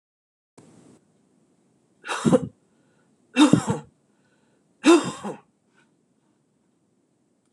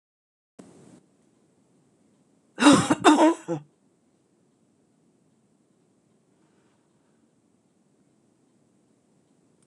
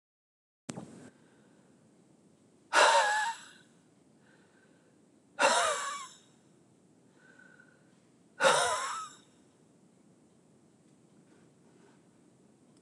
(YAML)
three_cough_length: 7.5 s
three_cough_amplitude: 24519
three_cough_signal_mean_std_ratio: 0.26
cough_length: 9.7 s
cough_amplitude: 25257
cough_signal_mean_std_ratio: 0.21
exhalation_length: 12.8 s
exhalation_amplitude: 10709
exhalation_signal_mean_std_ratio: 0.31
survey_phase: beta (2021-08-13 to 2022-03-07)
age: 65+
gender: Female
wearing_mask: 'No'
symptom_other: true
smoker_status: Never smoked
respiratory_condition_asthma: false
respiratory_condition_other: false
recruitment_source: Test and Trace
submission_delay: 1 day
covid_test_result: Positive
covid_test_method: ePCR